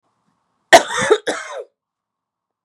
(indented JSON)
{
  "cough_length": "2.6 s",
  "cough_amplitude": 32768,
  "cough_signal_mean_std_ratio": 0.29,
  "survey_phase": "beta (2021-08-13 to 2022-03-07)",
  "age": "45-64",
  "gender": "Female",
  "wearing_mask": "No",
  "symptom_cough_any": true,
  "symptom_new_continuous_cough": true,
  "symptom_runny_or_blocked_nose": true,
  "symptom_shortness_of_breath": true,
  "symptom_fatigue": true,
  "symptom_fever_high_temperature": true,
  "symptom_headache": true,
  "symptom_change_to_sense_of_smell_or_taste": true,
  "symptom_onset": "6 days",
  "smoker_status": "Never smoked",
  "respiratory_condition_asthma": false,
  "respiratory_condition_other": true,
  "recruitment_source": "Test and Trace",
  "submission_delay": "2 days",
  "covid_test_result": "Positive",
  "covid_test_method": "RT-qPCR",
  "covid_ct_value": 11.1,
  "covid_ct_gene": "ORF1ab gene",
  "covid_ct_mean": 11.6,
  "covid_viral_load": "160000000 copies/ml",
  "covid_viral_load_category": "High viral load (>1M copies/ml)"
}